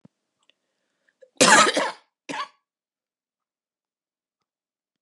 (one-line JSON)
{"cough_length": "5.0 s", "cough_amplitude": 27903, "cough_signal_mean_std_ratio": 0.24, "survey_phase": "beta (2021-08-13 to 2022-03-07)", "age": "45-64", "gender": "Female", "wearing_mask": "No", "symptom_cough_any": true, "symptom_new_continuous_cough": true, "symptom_runny_or_blocked_nose": true, "symptom_abdominal_pain": true, "symptom_fatigue": true, "symptom_fever_high_temperature": true, "symptom_headache": true, "symptom_change_to_sense_of_smell_or_taste": true, "symptom_loss_of_taste": true, "symptom_other": true, "symptom_onset": "6 days", "smoker_status": "Never smoked", "respiratory_condition_asthma": false, "respiratory_condition_other": false, "recruitment_source": "Test and Trace", "submission_delay": "4 days", "covid_test_result": "Positive", "covid_test_method": "RT-qPCR", "covid_ct_value": 20.0, "covid_ct_gene": "ORF1ab gene"}